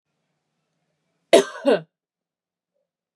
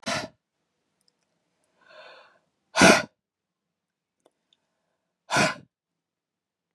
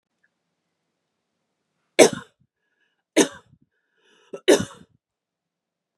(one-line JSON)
{"cough_length": "3.2 s", "cough_amplitude": 31070, "cough_signal_mean_std_ratio": 0.21, "exhalation_length": "6.7 s", "exhalation_amplitude": 24987, "exhalation_signal_mean_std_ratio": 0.22, "three_cough_length": "6.0 s", "three_cough_amplitude": 32767, "three_cough_signal_mean_std_ratio": 0.19, "survey_phase": "beta (2021-08-13 to 2022-03-07)", "age": "18-44", "gender": "Female", "wearing_mask": "No", "symptom_cough_any": true, "symptom_runny_or_blocked_nose": true, "symptom_sore_throat": true, "symptom_onset": "8 days", "smoker_status": "Ex-smoker", "respiratory_condition_asthma": false, "respiratory_condition_other": false, "recruitment_source": "REACT", "submission_delay": "2 days", "covid_test_result": "Negative", "covid_test_method": "RT-qPCR", "influenza_a_test_result": "Unknown/Void", "influenza_b_test_result": "Unknown/Void"}